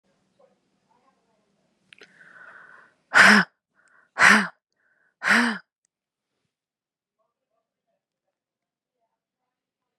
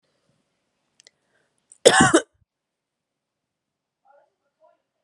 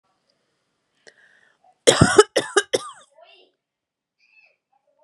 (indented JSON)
{
  "exhalation_length": "10.0 s",
  "exhalation_amplitude": 28061,
  "exhalation_signal_mean_std_ratio": 0.23,
  "cough_length": "5.0 s",
  "cough_amplitude": 32768,
  "cough_signal_mean_std_ratio": 0.19,
  "three_cough_length": "5.0 s",
  "three_cough_amplitude": 32768,
  "three_cough_signal_mean_std_ratio": 0.22,
  "survey_phase": "beta (2021-08-13 to 2022-03-07)",
  "age": "18-44",
  "gender": "Female",
  "wearing_mask": "No",
  "symptom_shortness_of_breath": true,
  "symptom_sore_throat": true,
  "symptom_headache": true,
  "symptom_change_to_sense_of_smell_or_taste": true,
  "symptom_onset": "4 days",
  "smoker_status": "Ex-smoker",
  "respiratory_condition_asthma": false,
  "respiratory_condition_other": false,
  "recruitment_source": "Test and Trace",
  "submission_delay": "2 days",
  "covid_test_result": "Positive",
  "covid_test_method": "RT-qPCR"
}